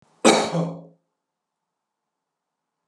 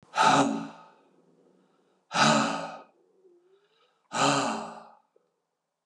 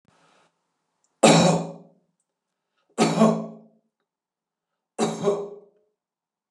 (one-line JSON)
{"cough_length": "2.9 s", "cough_amplitude": 26862, "cough_signal_mean_std_ratio": 0.29, "exhalation_length": "5.9 s", "exhalation_amplitude": 13280, "exhalation_signal_mean_std_ratio": 0.42, "three_cough_length": "6.5 s", "three_cough_amplitude": 28740, "three_cough_signal_mean_std_ratio": 0.34, "survey_phase": "beta (2021-08-13 to 2022-03-07)", "age": "65+", "gender": "Male", "wearing_mask": "No", "symptom_none": true, "smoker_status": "Never smoked", "respiratory_condition_asthma": false, "respiratory_condition_other": false, "recruitment_source": "REACT", "submission_delay": "11 days", "covid_test_result": "Negative", "covid_test_method": "RT-qPCR"}